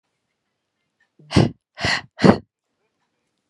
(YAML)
exhalation_length: 3.5 s
exhalation_amplitude: 32767
exhalation_signal_mean_std_ratio: 0.26
survey_phase: beta (2021-08-13 to 2022-03-07)
age: 18-44
gender: Female
wearing_mask: 'No'
symptom_none: true
smoker_status: Never smoked
respiratory_condition_asthma: false
respiratory_condition_other: false
recruitment_source: REACT
submission_delay: 3 days
covid_test_result: Negative
covid_test_method: RT-qPCR